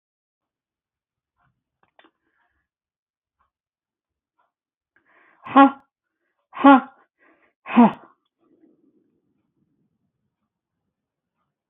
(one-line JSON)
{"exhalation_length": "11.7 s", "exhalation_amplitude": 27424, "exhalation_signal_mean_std_ratio": 0.17, "survey_phase": "beta (2021-08-13 to 2022-03-07)", "age": "65+", "gender": "Female", "wearing_mask": "No", "symptom_none": true, "smoker_status": "Ex-smoker", "respiratory_condition_asthma": false, "respiratory_condition_other": false, "recruitment_source": "REACT", "submission_delay": "1 day", "covid_test_result": "Negative", "covid_test_method": "RT-qPCR", "influenza_a_test_result": "Negative", "influenza_b_test_result": "Negative"}